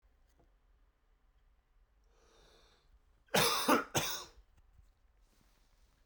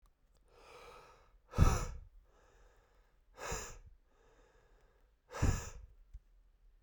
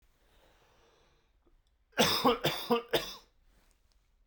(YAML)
cough_length: 6.1 s
cough_amplitude: 7273
cough_signal_mean_std_ratio: 0.29
exhalation_length: 6.8 s
exhalation_amplitude: 6429
exhalation_signal_mean_std_ratio: 0.29
three_cough_length: 4.3 s
three_cough_amplitude: 8023
three_cough_signal_mean_std_ratio: 0.35
survey_phase: beta (2021-08-13 to 2022-03-07)
age: 18-44
gender: Male
wearing_mask: 'No'
symptom_cough_any: true
symptom_runny_or_blocked_nose: true
symptom_headache: true
smoker_status: Never smoked
respiratory_condition_asthma: false
respiratory_condition_other: false
recruitment_source: Test and Trace
submission_delay: 1 day
covid_test_result: Positive
covid_test_method: RT-qPCR
covid_ct_value: 14.7
covid_ct_gene: ORF1ab gene
covid_ct_mean: 15.0
covid_viral_load: 12000000 copies/ml
covid_viral_load_category: High viral load (>1M copies/ml)